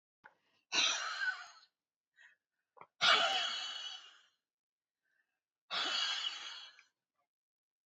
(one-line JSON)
{"exhalation_length": "7.9 s", "exhalation_amplitude": 5820, "exhalation_signal_mean_std_ratio": 0.41, "survey_phase": "beta (2021-08-13 to 2022-03-07)", "age": "65+", "gender": "Female", "wearing_mask": "No", "symptom_cough_any": true, "symptom_runny_or_blocked_nose": true, "symptom_onset": "5 days", "smoker_status": "Ex-smoker", "respiratory_condition_asthma": true, "respiratory_condition_other": false, "recruitment_source": "REACT", "submission_delay": "1 day", "covid_test_result": "Negative", "covid_test_method": "RT-qPCR", "influenza_a_test_result": "Negative", "influenza_b_test_result": "Negative"}